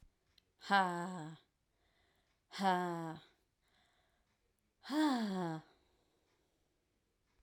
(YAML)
exhalation_length: 7.4 s
exhalation_amplitude: 3626
exhalation_signal_mean_std_ratio: 0.38
survey_phase: alpha (2021-03-01 to 2021-08-12)
age: 18-44
gender: Female
wearing_mask: 'No'
symptom_cough_any: true
symptom_new_continuous_cough: true
symptom_shortness_of_breath: true
symptom_fatigue: true
symptom_fever_high_temperature: true
symptom_headache: true
symptom_onset: 3 days
smoker_status: Ex-smoker
respiratory_condition_asthma: true
respiratory_condition_other: false
recruitment_source: Test and Trace
submission_delay: 2 days
covid_test_result: Positive
covid_test_method: RT-qPCR